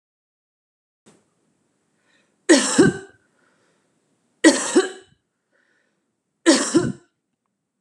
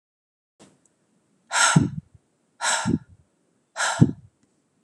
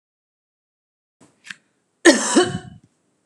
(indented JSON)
{
  "three_cough_length": "7.8 s",
  "three_cough_amplitude": 31162,
  "three_cough_signal_mean_std_ratio": 0.29,
  "exhalation_length": "4.8 s",
  "exhalation_amplitude": 28755,
  "exhalation_signal_mean_std_ratio": 0.34,
  "cough_length": "3.3 s",
  "cough_amplitude": 32768,
  "cough_signal_mean_std_ratio": 0.27,
  "survey_phase": "beta (2021-08-13 to 2022-03-07)",
  "age": "45-64",
  "gender": "Female",
  "wearing_mask": "No",
  "symptom_none": true,
  "smoker_status": "Ex-smoker",
  "respiratory_condition_asthma": false,
  "respiratory_condition_other": false,
  "recruitment_source": "REACT",
  "submission_delay": "2 days",
  "covid_test_result": "Negative",
  "covid_test_method": "RT-qPCR",
  "influenza_a_test_result": "Negative",
  "influenza_b_test_result": "Negative"
}